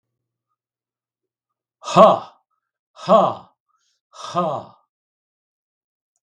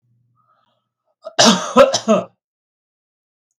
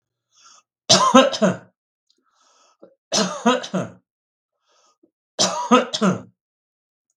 {"exhalation_length": "6.2 s", "exhalation_amplitude": 32768, "exhalation_signal_mean_std_ratio": 0.26, "cough_length": "3.6 s", "cough_amplitude": 32768, "cough_signal_mean_std_ratio": 0.33, "three_cough_length": "7.2 s", "three_cough_amplitude": 32768, "three_cough_signal_mean_std_ratio": 0.37, "survey_phase": "beta (2021-08-13 to 2022-03-07)", "age": "65+", "gender": "Male", "wearing_mask": "No", "symptom_none": true, "smoker_status": "Never smoked", "respiratory_condition_asthma": false, "respiratory_condition_other": false, "recruitment_source": "REACT", "submission_delay": "8 days", "covid_test_result": "Negative", "covid_test_method": "RT-qPCR", "influenza_a_test_result": "Negative", "influenza_b_test_result": "Negative"}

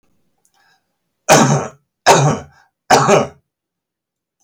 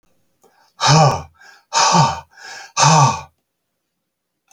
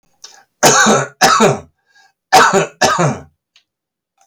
{"three_cough_length": "4.4 s", "three_cough_amplitude": 32768, "three_cough_signal_mean_std_ratio": 0.4, "exhalation_length": "4.5 s", "exhalation_amplitude": 31701, "exhalation_signal_mean_std_ratio": 0.44, "cough_length": "4.3 s", "cough_amplitude": 32768, "cough_signal_mean_std_ratio": 0.51, "survey_phase": "alpha (2021-03-01 to 2021-08-12)", "age": "65+", "gender": "Male", "wearing_mask": "No", "symptom_none": true, "smoker_status": "Never smoked", "respiratory_condition_asthma": false, "respiratory_condition_other": false, "recruitment_source": "REACT", "submission_delay": "1 day", "covid_test_result": "Negative", "covid_test_method": "RT-qPCR"}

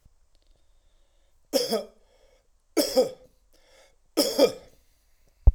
{"three_cough_length": "5.5 s", "three_cough_amplitude": 20639, "three_cough_signal_mean_std_ratio": 0.29, "survey_phase": "alpha (2021-03-01 to 2021-08-12)", "age": "45-64", "gender": "Male", "wearing_mask": "No", "symptom_cough_any": true, "symptom_abdominal_pain": true, "symptom_fatigue": true, "symptom_headache": true, "symptom_change_to_sense_of_smell_or_taste": true, "symptom_onset": "8 days", "smoker_status": "Never smoked", "respiratory_condition_asthma": false, "respiratory_condition_other": false, "recruitment_source": "Test and Trace", "submission_delay": "2 days", "covid_test_result": "Positive", "covid_test_method": "RT-qPCR", "covid_ct_value": 13.6, "covid_ct_gene": "ORF1ab gene", "covid_ct_mean": 14.1, "covid_viral_load": "24000000 copies/ml", "covid_viral_load_category": "High viral load (>1M copies/ml)"}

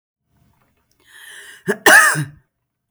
{"cough_length": "2.9 s", "cough_amplitude": 32305, "cough_signal_mean_std_ratio": 0.31, "survey_phase": "beta (2021-08-13 to 2022-03-07)", "age": "18-44", "gender": "Female", "wearing_mask": "No", "symptom_none": true, "smoker_status": "Ex-smoker", "respiratory_condition_asthma": false, "respiratory_condition_other": false, "recruitment_source": "REACT", "submission_delay": "1 day", "covid_test_result": "Negative", "covid_test_method": "RT-qPCR"}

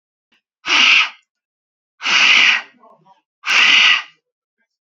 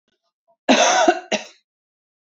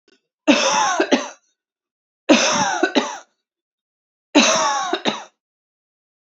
{"exhalation_length": "4.9 s", "exhalation_amplitude": 32531, "exhalation_signal_mean_std_ratio": 0.48, "cough_length": "2.2 s", "cough_amplitude": 27943, "cough_signal_mean_std_ratio": 0.41, "three_cough_length": "6.3 s", "three_cough_amplitude": 32636, "three_cough_signal_mean_std_ratio": 0.47, "survey_phase": "alpha (2021-03-01 to 2021-08-12)", "age": "45-64", "gender": "Female", "wearing_mask": "No", "symptom_none": true, "smoker_status": "Never smoked", "respiratory_condition_asthma": false, "respiratory_condition_other": false, "recruitment_source": "REACT", "submission_delay": "1 day", "covid_test_result": "Negative", "covid_test_method": "RT-qPCR"}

